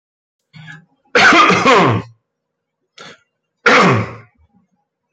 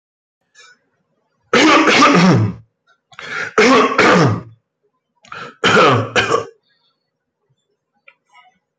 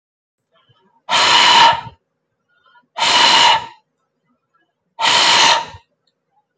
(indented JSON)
{
  "cough_length": "5.1 s",
  "cough_amplitude": 30888,
  "cough_signal_mean_std_ratio": 0.44,
  "three_cough_length": "8.8 s",
  "three_cough_amplitude": 29677,
  "three_cough_signal_mean_std_ratio": 0.48,
  "exhalation_length": "6.6 s",
  "exhalation_amplitude": 29547,
  "exhalation_signal_mean_std_ratio": 0.47,
  "survey_phase": "beta (2021-08-13 to 2022-03-07)",
  "age": "45-64",
  "gender": "Male",
  "wearing_mask": "No",
  "symptom_none": true,
  "smoker_status": "Ex-smoker",
  "respiratory_condition_asthma": false,
  "respiratory_condition_other": false,
  "recruitment_source": "REACT",
  "submission_delay": "2 days",
  "covid_test_result": "Negative",
  "covid_test_method": "RT-qPCR"
}